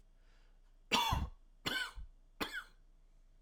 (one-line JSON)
{"three_cough_length": "3.4 s", "three_cough_amplitude": 4171, "three_cough_signal_mean_std_ratio": 0.46, "survey_phase": "alpha (2021-03-01 to 2021-08-12)", "age": "18-44", "gender": "Male", "wearing_mask": "No", "symptom_none": true, "smoker_status": "Never smoked", "respiratory_condition_asthma": false, "respiratory_condition_other": false, "recruitment_source": "REACT", "submission_delay": "2 days", "covid_test_result": "Negative", "covid_test_method": "RT-qPCR"}